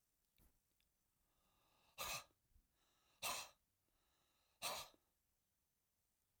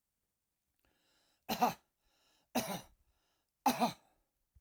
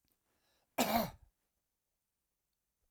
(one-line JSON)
{"exhalation_length": "6.4 s", "exhalation_amplitude": 771, "exhalation_signal_mean_std_ratio": 0.3, "three_cough_length": "4.6 s", "three_cough_amplitude": 3827, "three_cough_signal_mean_std_ratio": 0.29, "cough_length": "2.9 s", "cough_amplitude": 4963, "cough_signal_mean_std_ratio": 0.26, "survey_phase": "alpha (2021-03-01 to 2021-08-12)", "age": "65+", "gender": "Male", "wearing_mask": "No", "symptom_none": true, "smoker_status": "Ex-smoker", "respiratory_condition_asthma": false, "respiratory_condition_other": false, "recruitment_source": "REACT", "submission_delay": "2 days", "covid_test_result": "Negative", "covid_test_method": "RT-qPCR"}